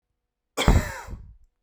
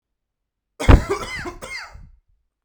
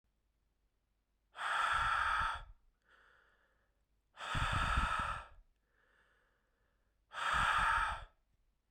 {"cough_length": "1.6 s", "cough_amplitude": 32228, "cough_signal_mean_std_ratio": 0.35, "three_cough_length": "2.6 s", "three_cough_amplitude": 32768, "three_cough_signal_mean_std_ratio": 0.28, "exhalation_length": "8.7 s", "exhalation_amplitude": 3058, "exhalation_signal_mean_std_ratio": 0.5, "survey_phase": "beta (2021-08-13 to 2022-03-07)", "age": "18-44", "gender": "Male", "wearing_mask": "No", "symptom_cough_any": true, "symptom_new_continuous_cough": true, "symptom_runny_or_blocked_nose": true, "symptom_shortness_of_breath": true, "symptom_sore_throat": true, "symptom_fatigue": true, "symptom_headache": true, "symptom_change_to_sense_of_smell_or_taste": true, "symptom_other": true, "symptom_onset": "3 days", "smoker_status": "Never smoked", "respiratory_condition_asthma": false, "respiratory_condition_other": false, "recruitment_source": "Test and Trace", "submission_delay": "1 day", "covid_test_result": "Positive", "covid_test_method": "ePCR"}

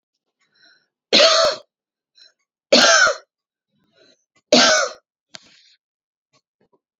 {"three_cough_length": "7.0 s", "three_cough_amplitude": 32767, "three_cough_signal_mean_std_ratio": 0.34, "survey_phase": "beta (2021-08-13 to 2022-03-07)", "age": "45-64", "gender": "Female", "wearing_mask": "No", "symptom_none": true, "smoker_status": "Current smoker (e-cigarettes or vapes only)", "respiratory_condition_asthma": true, "respiratory_condition_other": false, "recruitment_source": "REACT", "submission_delay": "3 days", "covid_test_result": "Negative", "covid_test_method": "RT-qPCR", "influenza_a_test_result": "Negative", "influenza_b_test_result": "Negative"}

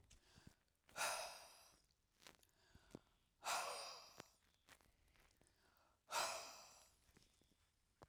{"exhalation_length": "8.1 s", "exhalation_amplitude": 1011, "exhalation_signal_mean_std_ratio": 0.38, "survey_phase": "alpha (2021-03-01 to 2021-08-12)", "age": "65+", "gender": "Female", "wearing_mask": "No", "symptom_none": true, "smoker_status": "Ex-smoker", "respiratory_condition_asthma": false, "respiratory_condition_other": false, "recruitment_source": "REACT", "submission_delay": "1 day", "covid_test_result": "Negative", "covid_test_method": "RT-qPCR"}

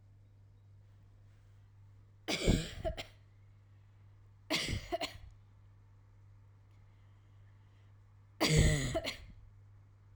{"three_cough_length": "10.2 s", "three_cough_amplitude": 6055, "three_cough_signal_mean_std_ratio": 0.38, "survey_phase": "alpha (2021-03-01 to 2021-08-12)", "age": "18-44", "gender": "Female", "wearing_mask": "No", "symptom_none": true, "smoker_status": "Never smoked", "respiratory_condition_asthma": false, "respiratory_condition_other": false, "recruitment_source": "REACT", "submission_delay": "1 day", "covid_test_result": "Negative", "covid_test_method": "RT-qPCR"}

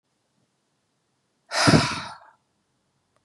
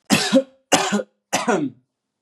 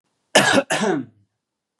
{"exhalation_length": "3.2 s", "exhalation_amplitude": 22195, "exhalation_signal_mean_std_ratio": 0.28, "three_cough_length": "2.2 s", "three_cough_amplitude": 31462, "three_cough_signal_mean_std_ratio": 0.52, "cough_length": "1.8 s", "cough_amplitude": 29763, "cough_signal_mean_std_ratio": 0.46, "survey_phase": "beta (2021-08-13 to 2022-03-07)", "age": "18-44", "gender": "Male", "wearing_mask": "Yes", "symptom_runny_or_blocked_nose": true, "symptom_fatigue": true, "symptom_headache": true, "symptom_onset": "2 days", "smoker_status": "Never smoked", "respiratory_condition_asthma": false, "respiratory_condition_other": false, "recruitment_source": "Test and Trace", "submission_delay": "2 days", "covid_test_result": "Positive", "covid_test_method": "ePCR"}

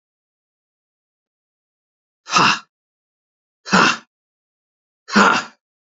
{"exhalation_length": "6.0 s", "exhalation_amplitude": 32767, "exhalation_signal_mean_std_ratio": 0.29, "survey_phase": "alpha (2021-03-01 to 2021-08-12)", "age": "65+", "gender": "Male", "wearing_mask": "No", "symptom_none": true, "smoker_status": "Never smoked", "respiratory_condition_asthma": false, "respiratory_condition_other": false, "recruitment_source": "REACT", "submission_delay": "3 days", "covid_test_result": "Negative", "covid_test_method": "RT-qPCR"}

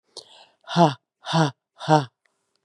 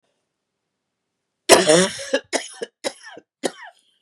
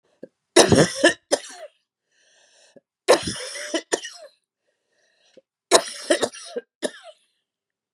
{"exhalation_length": "2.6 s", "exhalation_amplitude": 27813, "exhalation_signal_mean_std_ratio": 0.34, "cough_length": "4.0 s", "cough_amplitude": 32768, "cough_signal_mean_std_ratio": 0.31, "three_cough_length": "7.9 s", "three_cough_amplitude": 32767, "three_cough_signal_mean_std_ratio": 0.3, "survey_phase": "beta (2021-08-13 to 2022-03-07)", "age": "45-64", "gender": "Female", "wearing_mask": "No", "symptom_none": true, "symptom_onset": "5 days", "smoker_status": "Ex-smoker", "respiratory_condition_asthma": false, "respiratory_condition_other": false, "recruitment_source": "Test and Trace", "submission_delay": "2 days", "covid_test_result": "Positive", "covid_test_method": "ePCR"}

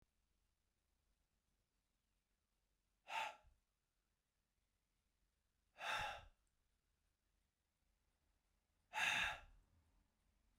{"exhalation_length": "10.6 s", "exhalation_amplitude": 1512, "exhalation_signal_mean_std_ratio": 0.26, "survey_phase": "beta (2021-08-13 to 2022-03-07)", "age": "45-64", "gender": "Male", "wearing_mask": "No", "symptom_none": true, "smoker_status": "Never smoked", "respiratory_condition_asthma": false, "respiratory_condition_other": false, "recruitment_source": "REACT", "submission_delay": "1 day", "covid_test_result": "Negative", "covid_test_method": "RT-qPCR"}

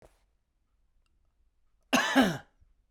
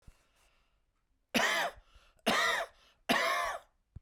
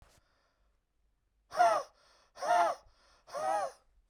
{"cough_length": "2.9 s", "cough_amplitude": 11444, "cough_signal_mean_std_ratio": 0.3, "three_cough_length": "4.0 s", "three_cough_amplitude": 5532, "three_cough_signal_mean_std_ratio": 0.48, "exhalation_length": "4.1 s", "exhalation_amplitude": 5925, "exhalation_signal_mean_std_ratio": 0.4, "survey_phase": "beta (2021-08-13 to 2022-03-07)", "age": "45-64", "gender": "Male", "wearing_mask": "No", "symptom_none": true, "smoker_status": "Ex-smoker", "respiratory_condition_asthma": false, "respiratory_condition_other": false, "recruitment_source": "REACT", "submission_delay": "1 day", "covid_test_result": "Negative", "covid_test_method": "RT-qPCR"}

